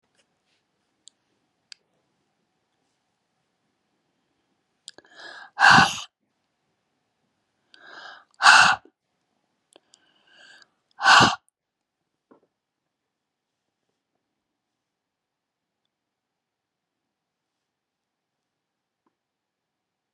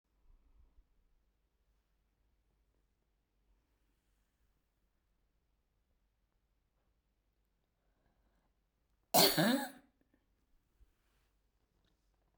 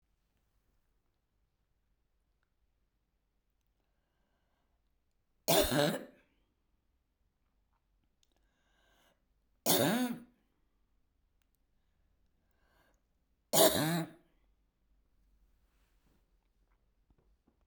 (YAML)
exhalation_length: 20.1 s
exhalation_amplitude: 29611
exhalation_signal_mean_std_ratio: 0.18
cough_length: 12.4 s
cough_amplitude: 8192
cough_signal_mean_std_ratio: 0.17
three_cough_length: 17.7 s
three_cough_amplitude: 8919
three_cough_signal_mean_std_ratio: 0.23
survey_phase: beta (2021-08-13 to 2022-03-07)
age: 65+
gender: Female
wearing_mask: 'No'
symptom_none: true
smoker_status: Never smoked
respiratory_condition_asthma: false
respiratory_condition_other: false
recruitment_source: REACT
submission_delay: 3 days
covid_test_result: Negative
covid_test_method: RT-qPCR